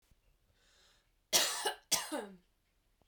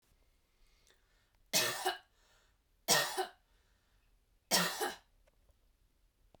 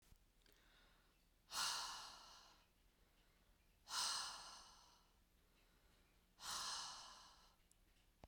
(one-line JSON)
{"cough_length": "3.1 s", "cough_amplitude": 7941, "cough_signal_mean_std_ratio": 0.35, "three_cough_length": "6.4 s", "three_cough_amplitude": 8045, "three_cough_signal_mean_std_ratio": 0.33, "exhalation_length": "8.3 s", "exhalation_amplitude": 935, "exhalation_signal_mean_std_ratio": 0.45, "survey_phase": "beta (2021-08-13 to 2022-03-07)", "age": "18-44", "gender": "Female", "wearing_mask": "No", "symptom_change_to_sense_of_smell_or_taste": true, "symptom_onset": "13 days", "smoker_status": "Never smoked", "respiratory_condition_asthma": false, "respiratory_condition_other": false, "recruitment_source": "REACT", "submission_delay": "1 day", "covid_test_result": "Negative", "covid_test_method": "RT-qPCR", "influenza_a_test_result": "Negative", "influenza_b_test_result": "Negative"}